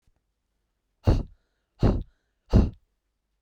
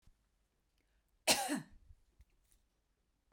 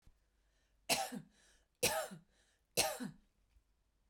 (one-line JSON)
{"exhalation_length": "3.4 s", "exhalation_amplitude": 17038, "exhalation_signal_mean_std_ratio": 0.3, "cough_length": "3.3 s", "cough_amplitude": 6258, "cough_signal_mean_std_ratio": 0.24, "three_cough_length": "4.1 s", "three_cough_amplitude": 4266, "three_cough_signal_mean_std_ratio": 0.35, "survey_phase": "beta (2021-08-13 to 2022-03-07)", "age": "45-64", "gender": "Female", "wearing_mask": "No", "symptom_none": true, "smoker_status": "Ex-smoker", "respiratory_condition_asthma": true, "respiratory_condition_other": false, "recruitment_source": "REACT", "submission_delay": "2 days", "covid_test_result": "Negative", "covid_test_method": "RT-qPCR"}